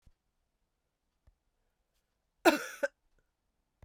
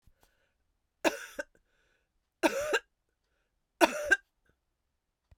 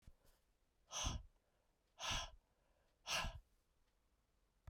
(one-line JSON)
{"cough_length": "3.8 s", "cough_amplitude": 11632, "cough_signal_mean_std_ratio": 0.17, "three_cough_length": "5.4 s", "three_cough_amplitude": 21590, "three_cough_signal_mean_std_ratio": 0.26, "exhalation_length": "4.7 s", "exhalation_amplitude": 1145, "exhalation_signal_mean_std_ratio": 0.38, "survey_phase": "beta (2021-08-13 to 2022-03-07)", "age": "65+", "gender": "Female", "wearing_mask": "No", "symptom_cough_any": true, "symptom_runny_or_blocked_nose": true, "symptom_fatigue": true, "symptom_fever_high_temperature": true, "symptom_onset": "4 days", "smoker_status": "Never smoked", "respiratory_condition_asthma": false, "respiratory_condition_other": false, "recruitment_source": "Test and Trace", "submission_delay": "2 days", "covid_test_result": "Positive", "covid_test_method": "RT-qPCR", "covid_ct_value": 18.9, "covid_ct_gene": "ORF1ab gene"}